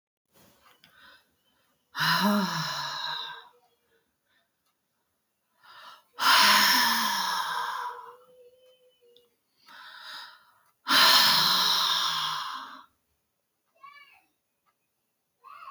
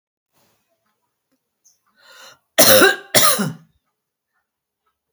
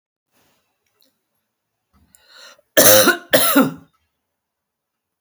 exhalation_length: 15.7 s
exhalation_amplitude: 13933
exhalation_signal_mean_std_ratio: 0.44
three_cough_length: 5.1 s
three_cough_amplitude: 32768
three_cough_signal_mean_std_ratio: 0.29
cough_length: 5.2 s
cough_amplitude: 32768
cough_signal_mean_std_ratio: 0.3
survey_phase: beta (2021-08-13 to 2022-03-07)
age: 65+
gender: Female
wearing_mask: 'No'
symptom_none: true
smoker_status: Never smoked
respiratory_condition_asthma: false
respiratory_condition_other: false
recruitment_source: REACT
submission_delay: 1 day
covid_test_result: Negative
covid_test_method: RT-qPCR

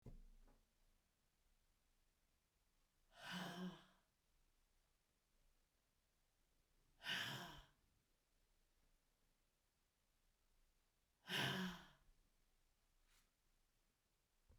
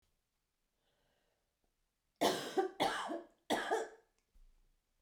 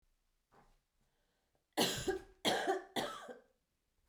exhalation_length: 14.6 s
exhalation_amplitude: 970
exhalation_signal_mean_std_ratio: 0.31
three_cough_length: 5.0 s
three_cough_amplitude: 4058
three_cough_signal_mean_std_ratio: 0.38
cough_length: 4.1 s
cough_amplitude: 3504
cough_signal_mean_std_ratio: 0.4
survey_phase: beta (2021-08-13 to 2022-03-07)
age: 45-64
gender: Female
wearing_mask: 'No'
symptom_cough_any: true
symptom_runny_or_blocked_nose: true
symptom_shortness_of_breath: true
symptom_sore_throat: true
symptom_onset: 2 days
smoker_status: Never smoked
respiratory_condition_asthma: false
respiratory_condition_other: false
recruitment_source: Test and Trace
submission_delay: 1 day
covid_test_result: Positive
covid_test_method: RT-qPCR
covid_ct_value: 24.1
covid_ct_gene: N gene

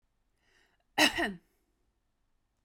cough_length: 2.6 s
cough_amplitude: 9455
cough_signal_mean_std_ratio: 0.26
survey_phase: beta (2021-08-13 to 2022-03-07)
age: 18-44
gender: Female
wearing_mask: 'No'
symptom_none: true
symptom_onset: 11 days
smoker_status: Current smoker (1 to 10 cigarettes per day)
respiratory_condition_asthma: false
respiratory_condition_other: false
recruitment_source: REACT
submission_delay: 3 days
covid_test_result: Negative
covid_test_method: RT-qPCR
influenza_a_test_result: Unknown/Void
influenza_b_test_result: Unknown/Void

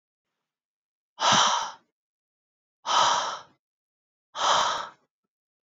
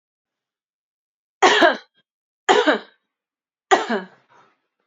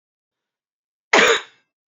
exhalation_length: 5.6 s
exhalation_amplitude: 13033
exhalation_signal_mean_std_ratio: 0.41
three_cough_length: 4.9 s
three_cough_amplitude: 29450
three_cough_signal_mean_std_ratio: 0.31
cough_length: 1.9 s
cough_amplitude: 30114
cough_signal_mean_std_ratio: 0.3
survey_phase: beta (2021-08-13 to 2022-03-07)
age: 18-44
gender: Female
wearing_mask: 'No'
symptom_cough_any: true
symptom_runny_or_blocked_nose: true
symptom_fatigue: true
symptom_headache: true
smoker_status: Never smoked
respiratory_condition_asthma: false
respiratory_condition_other: false
recruitment_source: Test and Trace
submission_delay: 2 days
covid_test_result: Positive
covid_test_method: RT-qPCR
covid_ct_value: 15.2
covid_ct_gene: ORF1ab gene
covid_ct_mean: 16.4
covid_viral_load: 4300000 copies/ml
covid_viral_load_category: High viral load (>1M copies/ml)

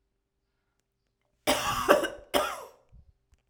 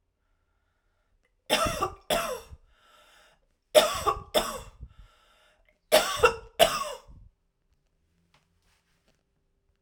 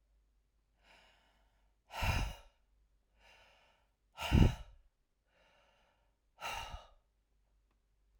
cough_length: 3.5 s
cough_amplitude: 21322
cough_signal_mean_std_ratio: 0.36
three_cough_length: 9.8 s
three_cough_amplitude: 20407
three_cough_signal_mean_std_ratio: 0.31
exhalation_length: 8.2 s
exhalation_amplitude: 7095
exhalation_signal_mean_std_ratio: 0.24
survey_phase: alpha (2021-03-01 to 2021-08-12)
age: 45-64
gender: Female
wearing_mask: 'No'
symptom_cough_any: true
symptom_new_continuous_cough: true
symptom_diarrhoea: true
symptom_fatigue: true
symptom_fever_high_temperature: true
symptom_headache: true
smoker_status: Never smoked
respiratory_condition_asthma: false
respiratory_condition_other: false
recruitment_source: Test and Trace
submission_delay: 1 day
covid_test_result: Positive
covid_test_method: RT-qPCR
covid_ct_value: 35.4
covid_ct_gene: N gene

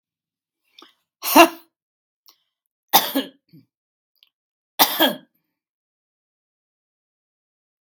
three_cough_length: 7.9 s
three_cough_amplitude: 32768
three_cough_signal_mean_std_ratio: 0.21
survey_phase: beta (2021-08-13 to 2022-03-07)
age: 65+
gender: Female
wearing_mask: 'No'
symptom_none: true
smoker_status: Prefer not to say
respiratory_condition_asthma: false
respiratory_condition_other: false
recruitment_source: REACT
submission_delay: 3 days
covid_test_result: Negative
covid_test_method: RT-qPCR
influenza_a_test_result: Negative
influenza_b_test_result: Negative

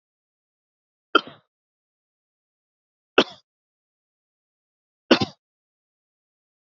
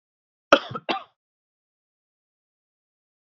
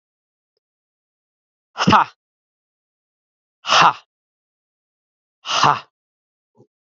three_cough_length: 6.7 s
three_cough_amplitude: 28284
three_cough_signal_mean_std_ratio: 0.13
cough_length: 3.2 s
cough_amplitude: 32767
cough_signal_mean_std_ratio: 0.15
exhalation_length: 7.0 s
exhalation_amplitude: 28281
exhalation_signal_mean_std_ratio: 0.25
survey_phase: beta (2021-08-13 to 2022-03-07)
age: 18-44
gender: Male
wearing_mask: 'No'
symptom_none: true
smoker_status: Current smoker (11 or more cigarettes per day)
respiratory_condition_asthma: false
respiratory_condition_other: false
recruitment_source: REACT
submission_delay: 2 days
covid_test_result: Negative
covid_test_method: RT-qPCR
influenza_a_test_result: Negative
influenza_b_test_result: Negative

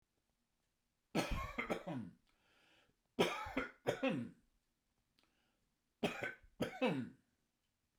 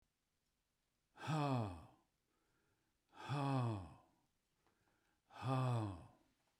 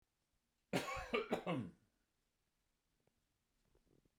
three_cough_length: 8.0 s
three_cough_amplitude: 3258
three_cough_signal_mean_std_ratio: 0.41
exhalation_length: 6.6 s
exhalation_amplitude: 1128
exhalation_signal_mean_std_ratio: 0.47
cough_length: 4.2 s
cough_amplitude: 2026
cough_signal_mean_std_ratio: 0.34
survey_phase: beta (2021-08-13 to 2022-03-07)
age: 65+
gender: Male
wearing_mask: 'No'
symptom_none: true
smoker_status: Ex-smoker
respiratory_condition_asthma: false
respiratory_condition_other: false
recruitment_source: REACT
submission_delay: 2 days
covid_test_result: Negative
covid_test_method: RT-qPCR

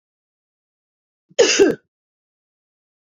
cough_length: 3.2 s
cough_amplitude: 26702
cough_signal_mean_std_ratio: 0.26
survey_phase: beta (2021-08-13 to 2022-03-07)
age: 45-64
gender: Female
wearing_mask: 'Yes'
symptom_runny_or_blocked_nose: true
symptom_sore_throat: true
symptom_fatigue: true
symptom_headache: true
symptom_other: true
symptom_onset: 3 days
smoker_status: Never smoked
respiratory_condition_asthma: false
respiratory_condition_other: false
recruitment_source: Test and Trace
submission_delay: 1 day
covid_test_result: Positive
covid_test_method: RT-qPCR
covid_ct_value: 21.8
covid_ct_gene: ORF1ab gene
covid_ct_mean: 22.3
covid_viral_load: 48000 copies/ml
covid_viral_load_category: Low viral load (10K-1M copies/ml)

